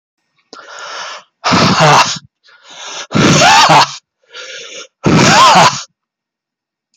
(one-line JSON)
{"exhalation_length": "7.0 s", "exhalation_amplitude": 32768, "exhalation_signal_mean_std_ratio": 0.56, "survey_phase": "beta (2021-08-13 to 2022-03-07)", "age": "45-64", "gender": "Male", "wearing_mask": "No", "symptom_none": true, "smoker_status": "Never smoked", "respiratory_condition_asthma": true, "respiratory_condition_other": false, "recruitment_source": "REACT", "submission_delay": "2 days", "covid_test_result": "Negative", "covid_test_method": "RT-qPCR", "influenza_a_test_result": "Negative", "influenza_b_test_result": "Negative"}